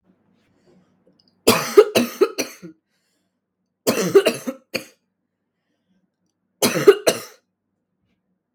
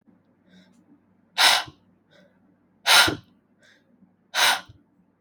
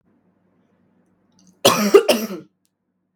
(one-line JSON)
{"three_cough_length": "8.5 s", "three_cough_amplitude": 32767, "three_cough_signal_mean_std_ratio": 0.29, "exhalation_length": "5.2 s", "exhalation_amplitude": 31084, "exhalation_signal_mean_std_ratio": 0.3, "cough_length": "3.2 s", "cough_amplitude": 32768, "cough_signal_mean_std_ratio": 0.3, "survey_phase": "beta (2021-08-13 to 2022-03-07)", "age": "18-44", "gender": "Female", "wearing_mask": "No", "symptom_cough_any": true, "symptom_runny_or_blocked_nose": true, "symptom_sore_throat": true, "smoker_status": "Prefer not to say", "respiratory_condition_asthma": false, "respiratory_condition_other": false, "recruitment_source": "Test and Trace", "submission_delay": "1 day", "covid_test_result": "Negative", "covid_test_method": "RT-qPCR"}